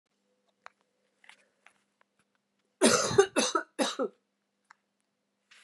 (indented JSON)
{
  "three_cough_length": "5.6 s",
  "three_cough_amplitude": 15086,
  "three_cough_signal_mean_std_ratio": 0.29,
  "survey_phase": "beta (2021-08-13 to 2022-03-07)",
  "age": "18-44",
  "gender": "Female",
  "wearing_mask": "No",
  "symptom_new_continuous_cough": true,
  "symptom_runny_or_blocked_nose": true,
  "symptom_fatigue": true,
  "symptom_change_to_sense_of_smell_or_taste": true,
  "symptom_other": true,
  "smoker_status": "Ex-smoker",
  "respiratory_condition_asthma": false,
  "respiratory_condition_other": false,
  "recruitment_source": "Test and Trace",
  "submission_delay": "3 days",
  "covid_test_result": "Positive",
  "covid_test_method": "RT-qPCR",
  "covid_ct_value": 23.3,
  "covid_ct_gene": "ORF1ab gene",
  "covid_ct_mean": 24.0,
  "covid_viral_load": "13000 copies/ml",
  "covid_viral_load_category": "Low viral load (10K-1M copies/ml)"
}